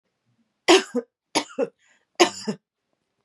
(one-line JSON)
{"three_cough_length": "3.2 s", "three_cough_amplitude": 28193, "three_cough_signal_mean_std_ratio": 0.29, "survey_phase": "beta (2021-08-13 to 2022-03-07)", "age": "45-64", "gender": "Female", "wearing_mask": "No", "symptom_sore_throat": true, "symptom_onset": "6 days", "smoker_status": "Ex-smoker", "respiratory_condition_asthma": false, "respiratory_condition_other": false, "recruitment_source": "Test and Trace", "submission_delay": "2 days", "covid_test_result": "Negative", "covid_test_method": "RT-qPCR"}